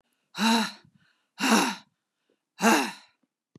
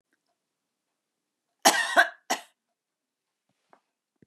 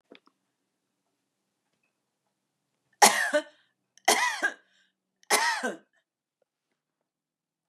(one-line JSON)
{"exhalation_length": "3.6 s", "exhalation_amplitude": 17039, "exhalation_signal_mean_std_ratio": 0.42, "cough_length": "4.3 s", "cough_amplitude": 19098, "cough_signal_mean_std_ratio": 0.22, "three_cough_length": "7.7 s", "three_cough_amplitude": 21850, "three_cough_signal_mean_std_ratio": 0.27, "survey_phase": "beta (2021-08-13 to 2022-03-07)", "age": "65+", "gender": "Female", "wearing_mask": "No", "symptom_none": true, "smoker_status": "Never smoked", "respiratory_condition_asthma": false, "respiratory_condition_other": false, "recruitment_source": "REACT", "submission_delay": "3 days", "covid_test_result": "Negative", "covid_test_method": "RT-qPCR", "influenza_a_test_result": "Negative", "influenza_b_test_result": "Negative"}